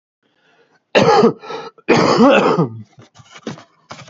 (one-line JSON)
{"cough_length": "4.1 s", "cough_amplitude": 29128, "cough_signal_mean_std_ratio": 0.49, "survey_phase": "beta (2021-08-13 to 2022-03-07)", "age": "45-64", "gender": "Male", "wearing_mask": "Yes", "symptom_cough_any": true, "symptom_runny_or_blocked_nose": true, "symptom_shortness_of_breath": true, "symptom_sore_throat": true, "symptom_abdominal_pain": true, "symptom_headache": true, "symptom_onset": "7 days", "smoker_status": "Ex-smoker", "respiratory_condition_asthma": false, "respiratory_condition_other": false, "recruitment_source": "Test and Trace", "submission_delay": "2 days", "covid_test_result": "Positive", "covid_test_method": "RT-qPCR", "covid_ct_value": 24.6, "covid_ct_gene": "N gene"}